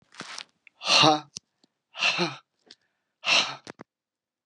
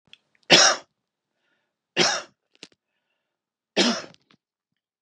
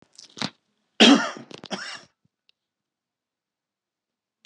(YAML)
exhalation_length: 4.5 s
exhalation_amplitude: 21946
exhalation_signal_mean_std_ratio: 0.36
three_cough_length: 5.0 s
three_cough_amplitude: 32466
three_cough_signal_mean_std_ratio: 0.28
cough_length: 4.5 s
cough_amplitude: 31627
cough_signal_mean_std_ratio: 0.22
survey_phase: beta (2021-08-13 to 2022-03-07)
age: 45-64
gender: Male
wearing_mask: 'Yes'
symptom_cough_any: true
symptom_runny_or_blocked_nose: true
symptom_sore_throat: true
symptom_fatigue: true
symptom_headache: true
smoker_status: Never smoked
respiratory_condition_asthma: false
respiratory_condition_other: false
recruitment_source: Test and Trace
submission_delay: 2 days
covid_test_result: Positive
covid_test_method: LAMP